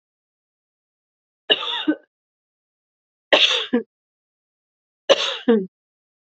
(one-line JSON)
{"three_cough_length": "6.2 s", "three_cough_amplitude": 30474, "three_cough_signal_mean_std_ratio": 0.31, "survey_phase": "beta (2021-08-13 to 2022-03-07)", "age": "18-44", "gender": "Female", "wearing_mask": "No", "symptom_cough_any": true, "symptom_new_continuous_cough": true, "symptom_runny_or_blocked_nose": true, "symptom_sore_throat": true, "symptom_fatigue": true, "symptom_other": true, "symptom_onset": "6 days", "smoker_status": "Never smoked", "respiratory_condition_asthma": false, "respiratory_condition_other": false, "recruitment_source": "Test and Trace", "submission_delay": "1 day", "covid_test_result": "Positive", "covid_test_method": "RT-qPCR", "covid_ct_value": 20.6, "covid_ct_gene": "N gene", "covid_ct_mean": 21.2, "covid_viral_load": "110000 copies/ml", "covid_viral_load_category": "Low viral load (10K-1M copies/ml)"}